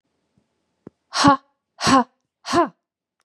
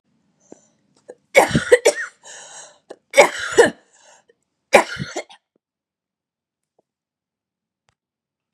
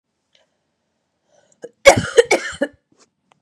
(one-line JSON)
{"exhalation_length": "3.2 s", "exhalation_amplitude": 32334, "exhalation_signal_mean_std_ratio": 0.34, "three_cough_length": "8.5 s", "three_cough_amplitude": 32768, "three_cough_signal_mean_std_ratio": 0.25, "cough_length": "3.4 s", "cough_amplitude": 32768, "cough_signal_mean_std_ratio": 0.25, "survey_phase": "beta (2021-08-13 to 2022-03-07)", "age": "45-64", "gender": "Female", "wearing_mask": "No", "symptom_cough_any": true, "symptom_sore_throat": true, "symptom_fatigue": true, "symptom_headache": true, "symptom_other": true, "symptom_onset": "4 days", "smoker_status": "Never smoked", "respiratory_condition_asthma": false, "respiratory_condition_other": false, "recruitment_source": "Test and Trace", "submission_delay": "2 days", "covid_test_result": "Positive", "covid_test_method": "RT-qPCR", "covid_ct_value": 19.1, "covid_ct_gene": "ORF1ab gene", "covid_ct_mean": 19.4, "covid_viral_load": "440000 copies/ml", "covid_viral_load_category": "Low viral load (10K-1M copies/ml)"}